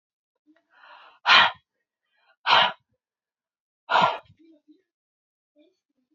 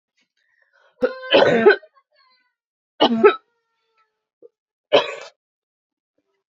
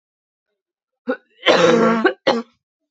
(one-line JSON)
{"exhalation_length": "6.1 s", "exhalation_amplitude": 23583, "exhalation_signal_mean_std_ratio": 0.27, "three_cough_length": "6.5 s", "three_cough_amplitude": 27990, "three_cough_signal_mean_std_ratio": 0.31, "cough_length": "2.9 s", "cough_amplitude": 28997, "cough_signal_mean_std_ratio": 0.45, "survey_phase": "beta (2021-08-13 to 2022-03-07)", "age": "18-44", "gender": "Female", "wearing_mask": "No", "symptom_cough_any": true, "symptom_new_continuous_cough": true, "symptom_runny_or_blocked_nose": true, "symptom_sore_throat": true, "symptom_fatigue": true, "symptom_headache": true, "symptom_onset": "2 days", "smoker_status": "Never smoked", "respiratory_condition_asthma": false, "respiratory_condition_other": false, "recruitment_source": "Test and Trace", "submission_delay": "1 day", "covid_test_result": "Positive", "covid_test_method": "ePCR"}